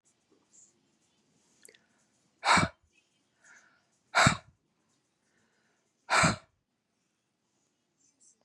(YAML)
exhalation_length: 8.4 s
exhalation_amplitude: 13280
exhalation_signal_mean_std_ratio: 0.23
survey_phase: beta (2021-08-13 to 2022-03-07)
age: 45-64
gender: Female
wearing_mask: 'No'
symptom_headache: true
smoker_status: Never smoked
respiratory_condition_asthma: false
respiratory_condition_other: false
recruitment_source: REACT
submission_delay: 2 days
covid_test_result: Negative
covid_test_method: RT-qPCR
influenza_a_test_result: Negative
influenza_b_test_result: Negative